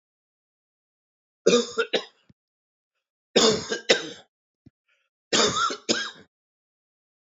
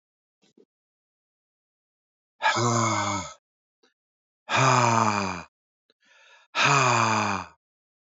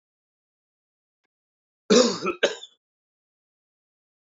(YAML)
three_cough_length: 7.3 s
three_cough_amplitude: 20639
three_cough_signal_mean_std_ratio: 0.34
exhalation_length: 8.2 s
exhalation_amplitude: 15937
exhalation_signal_mean_std_ratio: 0.46
cough_length: 4.4 s
cough_amplitude: 19161
cough_signal_mean_std_ratio: 0.24
survey_phase: beta (2021-08-13 to 2022-03-07)
age: 45-64
gender: Male
wearing_mask: 'No'
symptom_sore_throat: true
symptom_fatigue: true
symptom_onset: 10 days
smoker_status: Never smoked
respiratory_condition_asthma: false
respiratory_condition_other: false
recruitment_source: REACT
submission_delay: 3 days
covid_test_result: Negative
covid_test_method: RT-qPCR
influenza_a_test_result: Negative
influenza_b_test_result: Negative